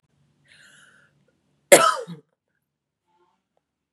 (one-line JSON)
{"cough_length": "3.9 s", "cough_amplitude": 32768, "cough_signal_mean_std_ratio": 0.19, "survey_phase": "beta (2021-08-13 to 2022-03-07)", "age": "18-44", "gender": "Female", "wearing_mask": "No", "symptom_sore_throat": true, "symptom_fatigue": true, "smoker_status": "Current smoker (e-cigarettes or vapes only)", "respiratory_condition_asthma": false, "respiratory_condition_other": false, "recruitment_source": "Test and Trace", "submission_delay": "1 day", "covid_test_result": "Positive", "covid_test_method": "RT-qPCR", "covid_ct_value": 19.3, "covid_ct_gene": "N gene", "covid_ct_mean": 20.0, "covid_viral_load": "270000 copies/ml", "covid_viral_load_category": "Low viral load (10K-1M copies/ml)"}